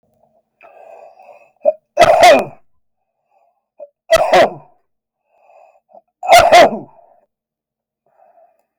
{"three_cough_length": "8.8 s", "three_cough_amplitude": 32768, "three_cough_signal_mean_std_ratio": 0.35, "survey_phase": "beta (2021-08-13 to 2022-03-07)", "age": "45-64", "gender": "Male", "wearing_mask": "No", "symptom_none": true, "smoker_status": "Never smoked", "respiratory_condition_asthma": false, "respiratory_condition_other": false, "recruitment_source": "REACT", "submission_delay": "3 days", "covid_test_result": "Negative", "covid_test_method": "RT-qPCR", "influenza_a_test_result": "Negative", "influenza_b_test_result": "Negative"}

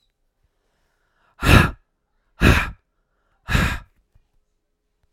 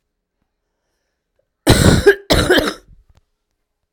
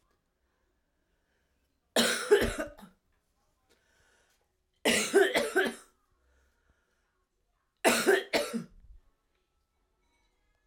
{"exhalation_length": "5.1 s", "exhalation_amplitude": 32768, "exhalation_signal_mean_std_ratio": 0.29, "cough_length": "3.9 s", "cough_amplitude": 32768, "cough_signal_mean_std_ratio": 0.37, "three_cough_length": "10.7 s", "three_cough_amplitude": 11709, "three_cough_signal_mean_std_ratio": 0.33, "survey_phase": "beta (2021-08-13 to 2022-03-07)", "age": "18-44", "gender": "Female", "wearing_mask": "No", "symptom_cough_any": true, "symptom_new_continuous_cough": true, "symptom_runny_or_blocked_nose": true, "symptom_sore_throat": true, "symptom_diarrhoea": true, "symptom_fatigue": true, "symptom_headache": true, "symptom_change_to_sense_of_smell_or_taste": true, "symptom_onset": "5 days", "smoker_status": "Never smoked", "respiratory_condition_asthma": false, "respiratory_condition_other": false, "recruitment_source": "Test and Trace", "submission_delay": "1 day", "covid_test_result": "Negative", "covid_test_method": "RT-qPCR"}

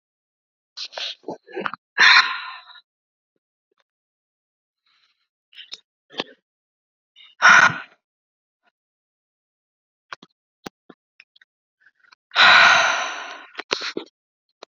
{"exhalation_length": "14.7 s", "exhalation_amplitude": 31694, "exhalation_signal_mean_std_ratio": 0.27, "survey_phase": "beta (2021-08-13 to 2022-03-07)", "age": "18-44", "gender": "Female", "wearing_mask": "No", "symptom_cough_any": true, "symptom_shortness_of_breath": true, "symptom_sore_throat": true, "symptom_fatigue": true, "symptom_change_to_sense_of_smell_or_taste": true, "symptom_onset": "4 days", "smoker_status": "Ex-smoker", "respiratory_condition_asthma": false, "respiratory_condition_other": false, "recruitment_source": "Test and Trace", "submission_delay": "2 days", "covid_test_result": "Positive", "covid_test_method": "ePCR"}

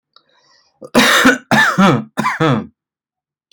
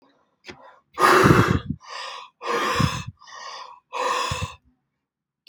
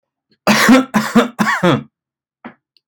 {"cough_length": "3.5 s", "cough_amplitude": 32487, "cough_signal_mean_std_ratio": 0.52, "exhalation_length": "5.5 s", "exhalation_amplitude": 25966, "exhalation_signal_mean_std_ratio": 0.46, "three_cough_length": "2.9 s", "three_cough_amplitude": 31855, "three_cough_signal_mean_std_ratio": 0.5, "survey_phase": "alpha (2021-03-01 to 2021-08-12)", "age": "18-44", "gender": "Male", "wearing_mask": "No", "symptom_none": true, "smoker_status": "Current smoker (e-cigarettes or vapes only)", "respiratory_condition_asthma": false, "respiratory_condition_other": false, "recruitment_source": "Test and Trace", "submission_delay": "0 days", "covid_test_result": "Negative", "covid_test_method": "LFT"}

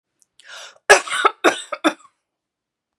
{"cough_length": "3.0 s", "cough_amplitude": 32768, "cough_signal_mean_std_ratio": 0.3, "survey_phase": "beta (2021-08-13 to 2022-03-07)", "age": "18-44", "gender": "Female", "wearing_mask": "No", "symptom_cough_any": true, "symptom_runny_or_blocked_nose": true, "symptom_shortness_of_breath": true, "symptom_sore_throat": true, "symptom_fatigue": true, "symptom_headache": true, "symptom_onset": "3 days", "smoker_status": "Ex-smoker", "respiratory_condition_asthma": true, "respiratory_condition_other": false, "recruitment_source": "Test and Trace", "submission_delay": "1 day", "covid_test_result": "Positive", "covid_test_method": "RT-qPCR", "covid_ct_value": 16.5, "covid_ct_gene": "ORF1ab gene", "covid_ct_mean": 16.8, "covid_viral_load": "3100000 copies/ml", "covid_viral_load_category": "High viral load (>1M copies/ml)"}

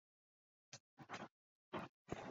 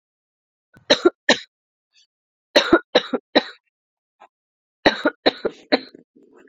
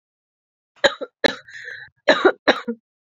{"exhalation_length": "2.3 s", "exhalation_amplitude": 895, "exhalation_signal_mean_std_ratio": 0.39, "three_cough_length": "6.5 s", "three_cough_amplitude": 29564, "three_cough_signal_mean_std_ratio": 0.27, "cough_length": "3.1 s", "cough_amplitude": 29838, "cough_signal_mean_std_ratio": 0.31, "survey_phase": "beta (2021-08-13 to 2022-03-07)", "age": "45-64", "gender": "Female", "wearing_mask": "No", "symptom_cough_any": true, "symptom_new_continuous_cough": true, "symptom_runny_or_blocked_nose": true, "symptom_shortness_of_breath": true, "symptom_sore_throat": true, "symptom_fatigue": true, "symptom_fever_high_temperature": true, "symptom_headache": true, "symptom_change_to_sense_of_smell_or_taste": true, "symptom_loss_of_taste": true, "smoker_status": "Ex-smoker", "respiratory_condition_asthma": false, "respiratory_condition_other": false, "recruitment_source": "Test and Trace", "submission_delay": "2 days", "covid_test_result": "Positive", "covid_test_method": "RT-qPCR"}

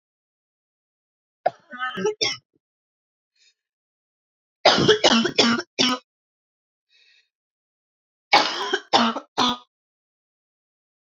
{"three_cough_length": "11.0 s", "three_cough_amplitude": 28421, "three_cough_signal_mean_std_ratio": 0.34, "survey_phase": "beta (2021-08-13 to 2022-03-07)", "age": "18-44", "gender": "Female", "wearing_mask": "No", "symptom_cough_any": true, "symptom_runny_or_blocked_nose": true, "symptom_fatigue": true, "symptom_headache": true, "symptom_onset": "3 days", "smoker_status": "Never smoked", "respiratory_condition_asthma": false, "respiratory_condition_other": false, "recruitment_source": "Test and Trace", "submission_delay": "2 days", "covid_test_result": "Positive", "covid_test_method": "RT-qPCR"}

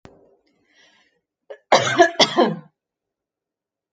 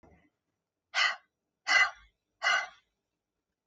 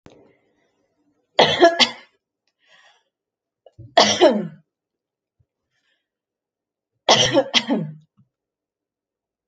{"cough_length": "3.9 s", "cough_amplitude": 30325, "cough_signal_mean_std_ratio": 0.3, "exhalation_length": "3.7 s", "exhalation_amplitude": 7939, "exhalation_signal_mean_std_ratio": 0.33, "three_cough_length": "9.5 s", "three_cough_amplitude": 28986, "three_cough_signal_mean_std_ratio": 0.3, "survey_phase": "alpha (2021-03-01 to 2021-08-12)", "age": "18-44", "gender": "Female", "wearing_mask": "No", "symptom_none": true, "smoker_status": "Ex-smoker", "respiratory_condition_asthma": false, "respiratory_condition_other": false, "recruitment_source": "REACT", "submission_delay": "5 days", "covid_test_result": "Negative", "covid_test_method": "RT-qPCR"}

